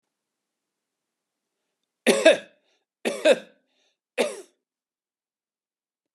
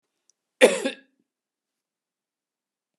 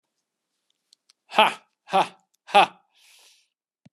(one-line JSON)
{"three_cough_length": "6.1 s", "three_cough_amplitude": 29280, "three_cough_signal_mean_std_ratio": 0.24, "cough_length": "3.0 s", "cough_amplitude": 28766, "cough_signal_mean_std_ratio": 0.19, "exhalation_length": "3.9 s", "exhalation_amplitude": 29119, "exhalation_signal_mean_std_ratio": 0.24, "survey_phase": "beta (2021-08-13 to 2022-03-07)", "age": "65+", "gender": "Male", "wearing_mask": "No", "symptom_runny_or_blocked_nose": true, "symptom_sore_throat": true, "symptom_onset": "4 days", "smoker_status": "Never smoked", "respiratory_condition_asthma": false, "respiratory_condition_other": false, "recruitment_source": "Test and Trace", "submission_delay": "3 days", "covid_test_result": "Positive", "covid_test_method": "LAMP"}